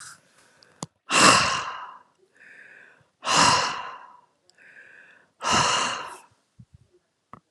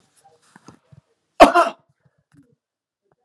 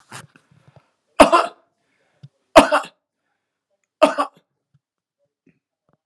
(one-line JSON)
{"exhalation_length": "7.5 s", "exhalation_amplitude": 32550, "exhalation_signal_mean_std_ratio": 0.39, "cough_length": "3.2 s", "cough_amplitude": 32768, "cough_signal_mean_std_ratio": 0.2, "three_cough_length": "6.1 s", "three_cough_amplitude": 32768, "three_cough_signal_mean_std_ratio": 0.22, "survey_phase": "alpha (2021-03-01 to 2021-08-12)", "age": "65+", "gender": "Male", "wearing_mask": "No", "symptom_none": true, "smoker_status": "Never smoked", "respiratory_condition_asthma": true, "respiratory_condition_other": false, "recruitment_source": "REACT", "submission_delay": "3 days", "covid_test_result": "Negative", "covid_test_method": "RT-qPCR"}